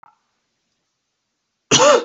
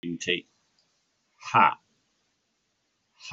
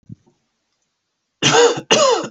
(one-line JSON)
{"cough_length": "2.0 s", "cough_amplitude": 29186, "cough_signal_mean_std_ratio": 0.32, "exhalation_length": "3.3 s", "exhalation_amplitude": 17437, "exhalation_signal_mean_std_ratio": 0.26, "three_cough_length": "2.3 s", "three_cough_amplitude": 29630, "three_cough_signal_mean_std_ratio": 0.47, "survey_phase": "beta (2021-08-13 to 2022-03-07)", "age": "18-44", "gender": "Male", "wearing_mask": "No", "symptom_none": true, "smoker_status": "Current smoker (e-cigarettes or vapes only)", "respiratory_condition_asthma": false, "respiratory_condition_other": false, "recruitment_source": "REACT", "submission_delay": "5 days", "covid_test_result": "Negative", "covid_test_method": "RT-qPCR"}